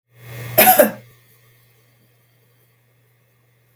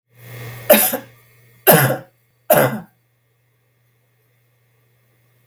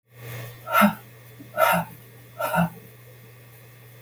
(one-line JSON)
{"cough_length": "3.8 s", "cough_amplitude": 32768, "cough_signal_mean_std_ratio": 0.26, "three_cough_length": "5.5 s", "three_cough_amplitude": 32768, "three_cough_signal_mean_std_ratio": 0.32, "exhalation_length": "4.0 s", "exhalation_amplitude": 18469, "exhalation_signal_mean_std_ratio": 0.44, "survey_phase": "beta (2021-08-13 to 2022-03-07)", "age": "45-64", "gender": "Female", "wearing_mask": "No", "symptom_none": true, "smoker_status": "Never smoked", "respiratory_condition_asthma": false, "respiratory_condition_other": false, "recruitment_source": "REACT", "submission_delay": "2 days", "covid_test_result": "Negative", "covid_test_method": "RT-qPCR", "influenza_a_test_result": "Unknown/Void", "influenza_b_test_result": "Unknown/Void"}